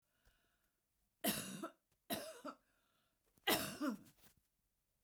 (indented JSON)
{
  "three_cough_length": "5.0 s",
  "three_cough_amplitude": 2860,
  "three_cough_signal_mean_std_ratio": 0.36,
  "survey_phase": "beta (2021-08-13 to 2022-03-07)",
  "age": "65+",
  "gender": "Female",
  "wearing_mask": "No",
  "symptom_none": true,
  "smoker_status": "Ex-smoker",
  "respiratory_condition_asthma": false,
  "respiratory_condition_other": false,
  "recruitment_source": "REACT",
  "submission_delay": "1 day",
  "covid_test_result": "Negative",
  "covid_test_method": "RT-qPCR"
}